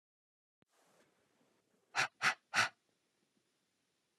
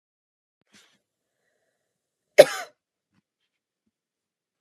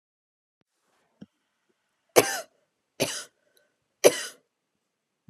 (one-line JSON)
{"exhalation_length": "4.2 s", "exhalation_amplitude": 3802, "exhalation_signal_mean_std_ratio": 0.23, "cough_length": "4.6 s", "cough_amplitude": 32768, "cough_signal_mean_std_ratio": 0.1, "three_cough_length": "5.3 s", "three_cough_amplitude": 29320, "three_cough_signal_mean_std_ratio": 0.19, "survey_phase": "beta (2021-08-13 to 2022-03-07)", "age": "18-44", "gender": "Female", "wearing_mask": "No", "symptom_none": true, "smoker_status": "Never smoked", "respiratory_condition_asthma": false, "respiratory_condition_other": false, "recruitment_source": "REACT", "submission_delay": "1 day", "covid_test_result": "Negative", "covid_test_method": "RT-qPCR"}